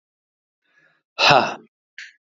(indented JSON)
{
  "exhalation_length": "2.3 s",
  "exhalation_amplitude": 27586,
  "exhalation_signal_mean_std_ratio": 0.29,
  "survey_phase": "beta (2021-08-13 to 2022-03-07)",
  "age": "45-64",
  "gender": "Male",
  "wearing_mask": "No",
  "symptom_cough_any": true,
  "smoker_status": "Ex-smoker",
  "respiratory_condition_asthma": false,
  "respiratory_condition_other": false,
  "recruitment_source": "REACT",
  "submission_delay": "1 day",
  "covid_test_result": "Negative",
  "covid_test_method": "RT-qPCR"
}